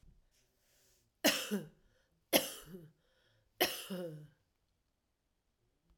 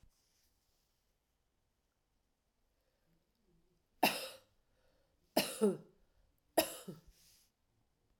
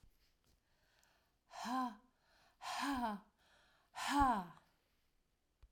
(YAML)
cough_length: 6.0 s
cough_amplitude: 9033
cough_signal_mean_std_ratio: 0.29
three_cough_length: 8.2 s
three_cough_amplitude: 5639
three_cough_signal_mean_std_ratio: 0.22
exhalation_length: 5.7 s
exhalation_amplitude: 3405
exhalation_signal_mean_std_ratio: 0.4
survey_phase: alpha (2021-03-01 to 2021-08-12)
age: 65+
gender: Female
wearing_mask: 'No'
symptom_none: true
smoker_status: Ex-smoker
respiratory_condition_asthma: false
respiratory_condition_other: false
recruitment_source: REACT
submission_delay: 1 day
covid_test_result: Negative
covid_test_method: RT-qPCR